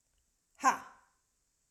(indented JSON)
{
  "exhalation_length": "1.7 s",
  "exhalation_amplitude": 7583,
  "exhalation_signal_mean_std_ratio": 0.22,
  "survey_phase": "alpha (2021-03-01 to 2021-08-12)",
  "age": "18-44",
  "gender": "Female",
  "wearing_mask": "No",
  "symptom_none": true,
  "smoker_status": "Ex-smoker",
  "respiratory_condition_asthma": false,
  "respiratory_condition_other": false,
  "recruitment_source": "REACT",
  "submission_delay": "1 day",
  "covid_test_result": "Negative",
  "covid_test_method": "RT-qPCR"
}